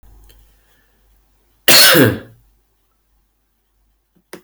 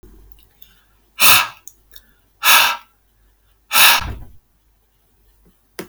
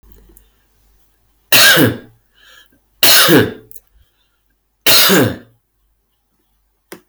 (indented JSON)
{
  "cough_length": "4.4 s",
  "cough_amplitude": 32768,
  "cough_signal_mean_std_ratio": 0.29,
  "exhalation_length": "5.9 s",
  "exhalation_amplitude": 32768,
  "exhalation_signal_mean_std_ratio": 0.33,
  "three_cough_length": "7.1 s",
  "three_cough_amplitude": 32768,
  "three_cough_signal_mean_std_ratio": 0.4,
  "survey_phase": "beta (2021-08-13 to 2022-03-07)",
  "age": "18-44",
  "gender": "Male",
  "wearing_mask": "No",
  "symptom_none": true,
  "smoker_status": "Ex-smoker",
  "respiratory_condition_asthma": false,
  "respiratory_condition_other": false,
  "recruitment_source": "REACT",
  "submission_delay": "1 day",
  "covid_test_result": "Negative",
  "covid_test_method": "RT-qPCR",
  "influenza_a_test_result": "Negative",
  "influenza_b_test_result": "Negative"
}